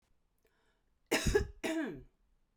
{
  "cough_length": "2.6 s",
  "cough_amplitude": 5272,
  "cough_signal_mean_std_ratio": 0.4,
  "survey_phase": "beta (2021-08-13 to 2022-03-07)",
  "age": "18-44",
  "gender": "Female",
  "wearing_mask": "No",
  "symptom_cough_any": true,
  "symptom_runny_or_blocked_nose": true,
  "symptom_fatigue": true,
  "symptom_onset": "8 days",
  "smoker_status": "Prefer not to say",
  "respiratory_condition_asthma": false,
  "respiratory_condition_other": false,
  "recruitment_source": "REACT",
  "submission_delay": "1 day",
  "covid_test_result": "Negative",
  "covid_test_method": "RT-qPCR"
}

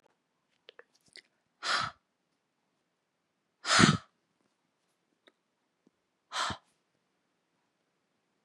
{
  "exhalation_length": "8.4 s",
  "exhalation_amplitude": 16198,
  "exhalation_signal_mean_std_ratio": 0.21,
  "survey_phase": "beta (2021-08-13 to 2022-03-07)",
  "age": "18-44",
  "gender": "Female",
  "wearing_mask": "No",
  "symptom_runny_or_blocked_nose": true,
  "symptom_sore_throat": true,
  "symptom_fatigue": true,
  "symptom_change_to_sense_of_smell_or_taste": true,
  "symptom_onset": "5 days",
  "smoker_status": "Never smoked",
  "respiratory_condition_asthma": false,
  "respiratory_condition_other": false,
  "recruitment_source": "Test and Trace",
  "submission_delay": "2 days",
  "covid_test_result": "Positive",
  "covid_test_method": "RT-qPCR",
  "covid_ct_value": 24.3,
  "covid_ct_gene": "ORF1ab gene",
  "covid_ct_mean": 24.3,
  "covid_viral_load": "11000 copies/ml",
  "covid_viral_load_category": "Low viral load (10K-1M copies/ml)"
}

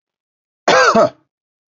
{
  "cough_length": "1.8 s",
  "cough_amplitude": 28543,
  "cough_signal_mean_std_ratio": 0.41,
  "survey_phase": "beta (2021-08-13 to 2022-03-07)",
  "age": "45-64",
  "gender": "Male",
  "wearing_mask": "No",
  "symptom_none": true,
  "smoker_status": "Never smoked",
  "respiratory_condition_asthma": false,
  "respiratory_condition_other": false,
  "recruitment_source": "Test and Trace",
  "submission_delay": "1 day",
  "covid_test_result": "Negative",
  "covid_test_method": "ePCR"
}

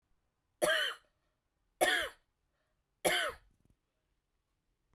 {
  "three_cough_length": "4.9 s",
  "three_cough_amplitude": 4893,
  "three_cough_signal_mean_std_ratio": 0.34,
  "survey_phase": "beta (2021-08-13 to 2022-03-07)",
  "age": "45-64",
  "gender": "Female",
  "wearing_mask": "No",
  "symptom_fatigue": true,
  "symptom_headache": true,
  "symptom_onset": "12 days",
  "smoker_status": "Never smoked",
  "respiratory_condition_asthma": true,
  "respiratory_condition_other": false,
  "recruitment_source": "REACT",
  "submission_delay": "1 day",
  "covid_test_result": "Negative",
  "covid_test_method": "RT-qPCR"
}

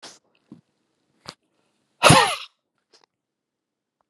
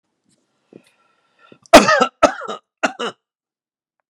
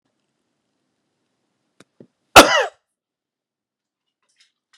{
  "exhalation_length": "4.1 s",
  "exhalation_amplitude": 32518,
  "exhalation_signal_mean_std_ratio": 0.22,
  "three_cough_length": "4.1 s",
  "three_cough_amplitude": 32768,
  "three_cough_signal_mean_std_ratio": 0.26,
  "cough_length": "4.8 s",
  "cough_amplitude": 32768,
  "cough_signal_mean_std_ratio": 0.16,
  "survey_phase": "beta (2021-08-13 to 2022-03-07)",
  "age": "45-64",
  "gender": "Male",
  "wearing_mask": "No",
  "symptom_cough_any": true,
  "smoker_status": "Never smoked",
  "respiratory_condition_asthma": false,
  "respiratory_condition_other": false,
  "recruitment_source": "REACT",
  "submission_delay": "1 day",
  "covid_test_result": "Negative",
  "covid_test_method": "RT-qPCR"
}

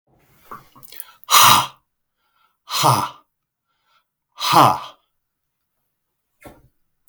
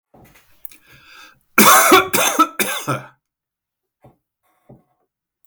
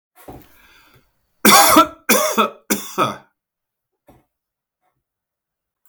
{
  "exhalation_length": "7.1 s",
  "exhalation_amplitude": 32768,
  "exhalation_signal_mean_std_ratio": 0.3,
  "cough_length": "5.5 s",
  "cough_amplitude": 32768,
  "cough_signal_mean_std_ratio": 0.35,
  "three_cough_length": "5.9 s",
  "three_cough_amplitude": 32768,
  "three_cough_signal_mean_std_ratio": 0.33,
  "survey_phase": "beta (2021-08-13 to 2022-03-07)",
  "age": "65+",
  "gender": "Male",
  "wearing_mask": "No",
  "symptom_none": true,
  "smoker_status": "Current smoker (1 to 10 cigarettes per day)",
  "respiratory_condition_asthma": false,
  "respiratory_condition_other": false,
  "recruitment_source": "REACT",
  "submission_delay": "0 days",
  "covid_test_result": "Negative",
  "covid_test_method": "RT-qPCR"
}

